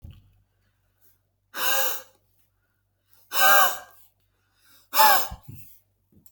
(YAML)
exhalation_length: 6.3 s
exhalation_amplitude: 22392
exhalation_signal_mean_std_ratio: 0.34
survey_phase: alpha (2021-03-01 to 2021-08-12)
age: 18-44
gender: Male
wearing_mask: 'No'
symptom_none: true
symptom_onset: 8 days
smoker_status: Never smoked
respiratory_condition_asthma: true
respiratory_condition_other: false
recruitment_source: REACT
submission_delay: 3 days
covid_test_result: Negative
covid_test_method: RT-qPCR